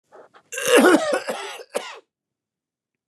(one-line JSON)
{"cough_length": "3.1 s", "cough_amplitude": 27712, "cough_signal_mean_std_ratio": 0.4, "survey_phase": "beta (2021-08-13 to 2022-03-07)", "age": "65+", "gender": "Male", "wearing_mask": "No", "symptom_none": true, "smoker_status": "Never smoked", "respiratory_condition_asthma": false, "respiratory_condition_other": false, "recruitment_source": "REACT", "submission_delay": "4 days", "covid_test_result": "Negative", "covid_test_method": "RT-qPCR", "influenza_a_test_result": "Negative", "influenza_b_test_result": "Negative"}